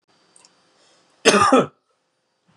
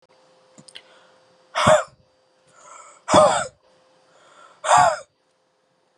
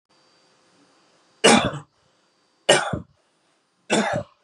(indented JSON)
{
  "cough_length": "2.6 s",
  "cough_amplitude": 32767,
  "cough_signal_mean_std_ratio": 0.32,
  "exhalation_length": "6.0 s",
  "exhalation_amplitude": 30154,
  "exhalation_signal_mean_std_ratio": 0.32,
  "three_cough_length": "4.4 s",
  "three_cough_amplitude": 31770,
  "three_cough_signal_mean_std_ratio": 0.32,
  "survey_phase": "beta (2021-08-13 to 2022-03-07)",
  "age": "45-64",
  "gender": "Male",
  "wearing_mask": "No",
  "symptom_cough_any": true,
  "symptom_sore_throat": true,
  "symptom_fatigue": true,
  "symptom_headache": true,
  "symptom_onset": "5 days",
  "smoker_status": "Never smoked",
  "respiratory_condition_asthma": false,
  "respiratory_condition_other": false,
  "recruitment_source": "Test and Trace",
  "submission_delay": "2 days",
  "covid_test_result": "Positive",
  "covid_test_method": "RT-qPCR",
  "covid_ct_value": 28.7,
  "covid_ct_gene": "N gene"
}